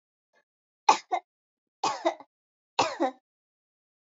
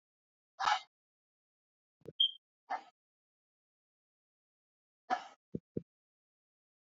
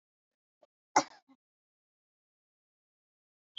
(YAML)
three_cough_length: 4.1 s
three_cough_amplitude: 19739
three_cough_signal_mean_std_ratio: 0.27
exhalation_length: 6.9 s
exhalation_amplitude: 4010
exhalation_signal_mean_std_ratio: 0.21
cough_length: 3.6 s
cough_amplitude: 9062
cough_signal_mean_std_ratio: 0.11
survey_phase: beta (2021-08-13 to 2022-03-07)
age: 18-44
gender: Female
wearing_mask: 'No'
symptom_fatigue: true
smoker_status: Never smoked
respiratory_condition_asthma: false
respiratory_condition_other: false
recruitment_source: REACT
submission_delay: 2 days
covid_test_result: Negative
covid_test_method: RT-qPCR
influenza_a_test_result: Negative
influenza_b_test_result: Negative